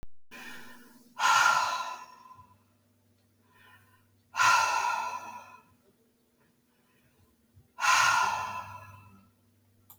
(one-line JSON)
{"exhalation_length": "10.0 s", "exhalation_amplitude": 10709, "exhalation_signal_mean_std_ratio": 0.43, "survey_phase": "beta (2021-08-13 to 2022-03-07)", "age": "45-64", "gender": "Female", "wearing_mask": "No", "symptom_none": true, "smoker_status": "Never smoked", "respiratory_condition_asthma": false, "respiratory_condition_other": false, "recruitment_source": "REACT", "submission_delay": "1 day", "covid_test_result": "Negative", "covid_test_method": "RT-qPCR"}